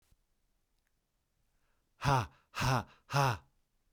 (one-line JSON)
{"exhalation_length": "3.9 s", "exhalation_amplitude": 4985, "exhalation_signal_mean_std_ratio": 0.37, "survey_phase": "beta (2021-08-13 to 2022-03-07)", "age": "45-64", "gender": "Male", "wearing_mask": "No", "symptom_none": true, "smoker_status": "Never smoked", "respiratory_condition_asthma": false, "respiratory_condition_other": false, "recruitment_source": "REACT", "submission_delay": "2 days", "covid_test_result": "Negative", "covid_test_method": "RT-qPCR", "influenza_a_test_result": "Negative", "influenza_b_test_result": "Negative"}